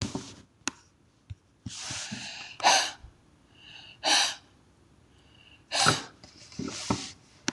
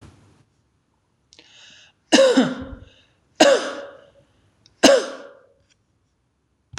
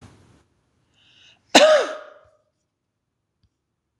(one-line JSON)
{"exhalation_length": "7.5 s", "exhalation_amplitude": 15041, "exhalation_signal_mean_std_ratio": 0.4, "three_cough_length": "6.8 s", "three_cough_amplitude": 26028, "three_cough_signal_mean_std_ratio": 0.31, "cough_length": "4.0 s", "cough_amplitude": 26028, "cough_signal_mean_std_ratio": 0.24, "survey_phase": "beta (2021-08-13 to 2022-03-07)", "age": "18-44", "gender": "Female", "wearing_mask": "No", "symptom_none": true, "symptom_onset": "3 days", "smoker_status": "Never smoked", "respiratory_condition_asthma": false, "respiratory_condition_other": false, "recruitment_source": "REACT", "submission_delay": "2 days", "covid_test_result": "Negative", "covid_test_method": "RT-qPCR", "influenza_a_test_result": "Negative", "influenza_b_test_result": "Negative"}